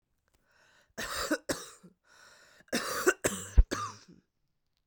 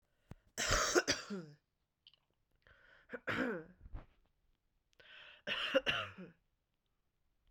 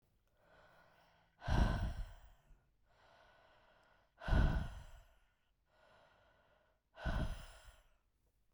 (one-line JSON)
{"cough_length": "4.9 s", "cough_amplitude": 13709, "cough_signal_mean_std_ratio": 0.31, "three_cough_length": "7.5 s", "three_cough_amplitude": 5910, "three_cough_signal_mean_std_ratio": 0.38, "exhalation_length": "8.5 s", "exhalation_amplitude": 3429, "exhalation_signal_mean_std_ratio": 0.35, "survey_phase": "beta (2021-08-13 to 2022-03-07)", "age": "18-44", "gender": "Female", "wearing_mask": "No", "symptom_cough_any": true, "symptom_new_continuous_cough": true, "symptom_runny_or_blocked_nose": true, "symptom_shortness_of_breath": true, "symptom_sore_throat": true, "symptom_fatigue": true, "symptom_fever_high_temperature": true, "symptom_onset": "3 days", "smoker_status": "Current smoker (1 to 10 cigarettes per day)", "respiratory_condition_asthma": true, "respiratory_condition_other": false, "recruitment_source": "Test and Trace", "submission_delay": "1 day", "covid_test_result": "Positive", "covid_test_method": "RT-qPCR", "covid_ct_value": 24.0, "covid_ct_gene": "ORF1ab gene", "covid_ct_mean": 25.1, "covid_viral_load": "6100 copies/ml", "covid_viral_load_category": "Minimal viral load (< 10K copies/ml)"}